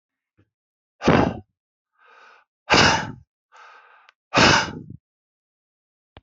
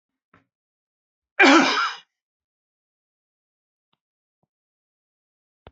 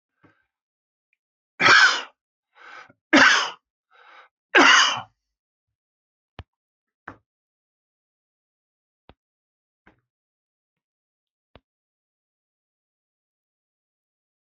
{"exhalation_length": "6.2 s", "exhalation_amplitude": 25717, "exhalation_signal_mean_std_ratio": 0.32, "cough_length": "5.7 s", "cough_amplitude": 24716, "cough_signal_mean_std_ratio": 0.23, "three_cough_length": "14.4 s", "three_cough_amplitude": 25291, "three_cough_signal_mean_std_ratio": 0.22, "survey_phase": "beta (2021-08-13 to 2022-03-07)", "age": "65+", "gender": "Male", "wearing_mask": "No", "symptom_none": true, "smoker_status": "Never smoked", "respiratory_condition_asthma": false, "respiratory_condition_other": false, "recruitment_source": "REACT", "submission_delay": "1 day", "covid_test_result": "Negative", "covid_test_method": "RT-qPCR", "influenza_a_test_result": "Negative", "influenza_b_test_result": "Negative"}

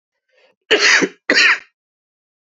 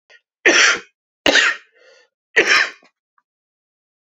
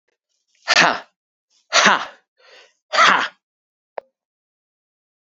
{"cough_length": "2.5 s", "cough_amplitude": 31796, "cough_signal_mean_std_ratio": 0.42, "three_cough_length": "4.2 s", "three_cough_amplitude": 30917, "three_cough_signal_mean_std_ratio": 0.38, "exhalation_length": "5.2 s", "exhalation_amplitude": 30597, "exhalation_signal_mean_std_ratio": 0.32, "survey_phase": "beta (2021-08-13 to 2022-03-07)", "age": "45-64", "gender": "Male", "wearing_mask": "Yes", "symptom_cough_any": true, "symptom_runny_or_blocked_nose": true, "symptom_fatigue": true, "symptom_headache": true, "symptom_change_to_sense_of_smell_or_taste": true, "symptom_loss_of_taste": true, "symptom_onset": "3 days", "smoker_status": "Never smoked", "respiratory_condition_asthma": false, "respiratory_condition_other": false, "recruitment_source": "Test and Trace", "submission_delay": "2 days", "covid_test_result": "Positive", "covid_test_method": "RT-qPCR", "covid_ct_value": 19.6, "covid_ct_gene": "ORF1ab gene"}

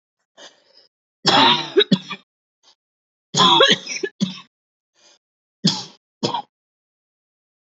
{"three_cough_length": "7.7 s", "three_cough_amplitude": 31511, "three_cough_signal_mean_std_ratio": 0.35, "survey_phase": "beta (2021-08-13 to 2022-03-07)", "age": "18-44", "gender": "Female", "wearing_mask": "No", "symptom_none": true, "smoker_status": "Ex-smoker", "respiratory_condition_asthma": false, "respiratory_condition_other": false, "recruitment_source": "REACT", "submission_delay": "3 days", "covid_test_result": "Negative", "covid_test_method": "RT-qPCR", "influenza_a_test_result": "Negative", "influenza_b_test_result": "Negative"}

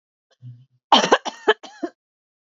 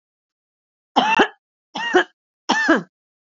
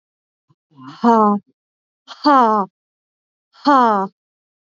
{"cough_length": "2.5 s", "cough_amplitude": 29436, "cough_signal_mean_std_ratio": 0.28, "three_cough_length": "3.2 s", "three_cough_amplitude": 28322, "three_cough_signal_mean_std_ratio": 0.39, "exhalation_length": "4.7 s", "exhalation_amplitude": 27712, "exhalation_signal_mean_std_ratio": 0.39, "survey_phase": "beta (2021-08-13 to 2022-03-07)", "age": "18-44", "gender": "Female", "wearing_mask": "No", "symptom_none": true, "smoker_status": "Current smoker (1 to 10 cigarettes per day)", "respiratory_condition_asthma": true, "respiratory_condition_other": false, "recruitment_source": "REACT", "submission_delay": "9 days", "covid_test_result": "Negative", "covid_test_method": "RT-qPCR", "influenza_a_test_result": "Negative", "influenza_b_test_result": "Negative"}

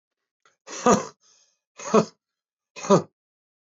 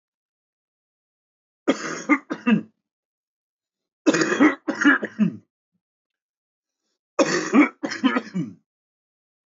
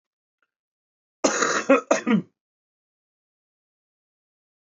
{"exhalation_length": "3.7 s", "exhalation_amplitude": 19093, "exhalation_signal_mean_std_ratio": 0.28, "three_cough_length": "9.6 s", "three_cough_amplitude": 19454, "three_cough_signal_mean_std_ratio": 0.36, "cough_length": "4.6 s", "cough_amplitude": 19942, "cough_signal_mean_std_ratio": 0.29, "survey_phase": "beta (2021-08-13 to 2022-03-07)", "age": "45-64", "gender": "Male", "wearing_mask": "No", "symptom_none": true, "symptom_onset": "5 days", "smoker_status": "Never smoked", "respiratory_condition_asthma": false, "respiratory_condition_other": true, "recruitment_source": "REACT", "submission_delay": "4 days", "covid_test_result": "Negative", "covid_test_method": "RT-qPCR", "influenza_a_test_result": "Negative", "influenza_b_test_result": "Negative"}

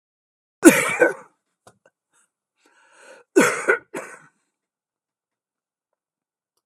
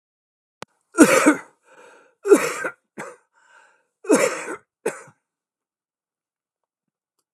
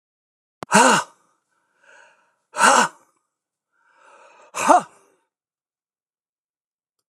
{"cough_length": "6.7 s", "cough_amplitude": 32768, "cough_signal_mean_std_ratio": 0.24, "three_cough_length": "7.3 s", "three_cough_amplitude": 32767, "three_cough_signal_mean_std_ratio": 0.28, "exhalation_length": "7.1 s", "exhalation_amplitude": 31944, "exhalation_signal_mean_std_ratio": 0.27, "survey_phase": "beta (2021-08-13 to 2022-03-07)", "age": "65+", "gender": "Male", "wearing_mask": "No", "symptom_shortness_of_breath": true, "smoker_status": "Ex-smoker", "respiratory_condition_asthma": false, "respiratory_condition_other": false, "recruitment_source": "REACT", "submission_delay": "1 day", "covid_test_result": "Negative", "covid_test_method": "RT-qPCR"}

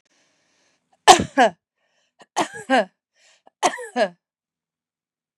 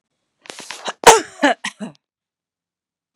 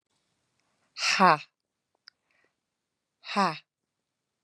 {"three_cough_length": "5.4 s", "three_cough_amplitude": 32768, "three_cough_signal_mean_std_ratio": 0.27, "cough_length": "3.2 s", "cough_amplitude": 32768, "cough_signal_mean_std_ratio": 0.25, "exhalation_length": "4.4 s", "exhalation_amplitude": 17214, "exhalation_signal_mean_std_ratio": 0.24, "survey_phase": "beta (2021-08-13 to 2022-03-07)", "age": "45-64", "gender": "Female", "wearing_mask": "No", "symptom_none": true, "smoker_status": "Never smoked", "respiratory_condition_asthma": true, "respiratory_condition_other": false, "recruitment_source": "REACT", "submission_delay": "2 days", "covid_test_result": "Negative", "covid_test_method": "RT-qPCR", "influenza_a_test_result": "Negative", "influenza_b_test_result": "Negative"}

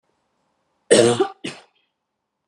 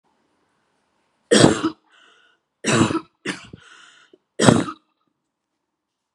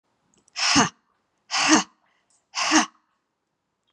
{"cough_length": "2.5 s", "cough_amplitude": 30631, "cough_signal_mean_std_ratio": 0.3, "three_cough_length": "6.1 s", "three_cough_amplitude": 32768, "three_cough_signal_mean_std_ratio": 0.3, "exhalation_length": "3.9 s", "exhalation_amplitude": 24734, "exhalation_signal_mean_std_ratio": 0.37, "survey_phase": "beta (2021-08-13 to 2022-03-07)", "age": "18-44", "gender": "Female", "wearing_mask": "No", "symptom_sore_throat": true, "symptom_headache": true, "smoker_status": "Never smoked", "respiratory_condition_asthma": false, "respiratory_condition_other": false, "recruitment_source": "Test and Trace", "submission_delay": "1 day", "covid_test_result": "Negative", "covid_test_method": "RT-qPCR"}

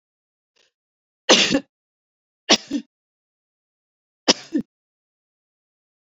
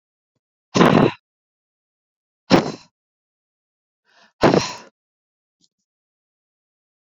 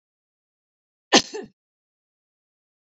{"three_cough_length": "6.1 s", "three_cough_amplitude": 32768, "three_cough_signal_mean_std_ratio": 0.23, "exhalation_length": "7.2 s", "exhalation_amplitude": 32768, "exhalation_signal_mean_std_ratio": 0.25, "cough_length": "2.8 s", "cough_amplitude": 30131, "cough_signal_mean_std_ratio": 0.15, "survey_phase": "beta (2021-08-13 to 2022-03-07)", "age": "18-44", "gender": "Female", "wearing_mask": "No", "symptom_sore_throat": true, "symptom_headache": true, "symptom_onset": "12 days", "smoker_status": "Never smoked", "respiratory_condition_asthma": false, "respiratory_condition_other": false, "recruitment_source": "REACT", "submission_delay": "1 day", "covid_test_result": "Negative", "covid_test_method": "RT-qPCR"}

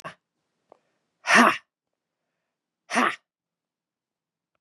{"exhalation_length": "4.6 s", "exhalation_amplitude": 24247, "exhalation_signal_mean_std_ratio": 0.24, "survey_phase": "beta (2021-08-13 to 2022-03-07)", "age": "45-64", "gender": "Female", "wearing_mask": "No", "symptom_cough_any": true, "symptom_runny_or_blocked_nose": true, "symptom_fatigue": true, "symptom_headache": true, "smoker_status": "Never smoked", "respiratory_condition_asthma": false, "respiratory_condition_other": false, "recruitment_source": "Test and Trace", "submission_delay": "2 days", "covid_test_result": "Positive", "covid_test_method": "RT-qPCR", "covid_ct_value": 30.1, "covid_ct_gene": "ORF1ab gene", "covid_ct_mean": 30.5, "covid_viral_load": "98 copies/ml", "covid_viral_load_category": "Minimal viral load (< 10K copies/ml)"}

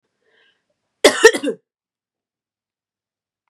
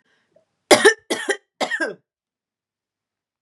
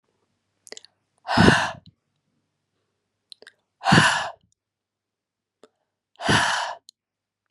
{"cough_length": "3.5 s", "cough_amplitude": 32768, "cough_signal_mean_std_ratio": 0.21, "three_cough_length": "3.4 s", "three_cough_amplitude": 32767, "three_cough_signal_mean_std_ratio": 0.28, "exhalation_length": "7.5 s", "exhalation_amplitude": 30961, "exhalation_signal_mean_std_ratio": 0.31, "survey_phase": "beta (2021-08-13 to 2022-03-07)", "age": "18-44", "gender": "Female", "wearing_mask": "No", "symptom_none": true, "symptom_onset": "12 days", "smoker_status": "Never smoked", "respiratory_condition_asthma": false, "respiratory_condition_other": false, "recruitment_source": "REACT", "submission_delay": "0 days", "covid_test_result": "Negative", "covid_test_method": "RT-qPCR", "influenza_a_test_result": "Negative", "influenza_b_test_result": "Negative"}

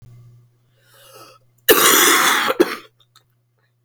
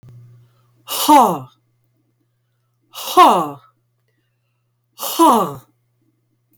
{"cough_length": "3.8 s", "cough_amplitude": 32768, "cough_signal_mean_std_ratio": 0.42, "exhalation_length": "6.6 s", "exhalation_amplitude": 30456, "exhalation_signal_mean_std_ratio": 0.34, "survey_phase": "beta (2021-08-13 to 2022-03-07)", "age": "45-64", "gender": "Female", "wearing_mask": "No", "symptom_cough_any": true, "symptom_runny_or_blocked_nose": true, "symptom_fatigue": true, "symptom_onset": "6 days", "smoker_status": "Never smoked", "respiratory_condition_asthma": true, "respiratory_condition_other": false, "recruitment_source": "REACT", "submission_delay": "1 day", "covid_test_result": "Negative", "covid_test_method": "RT-qPCR"}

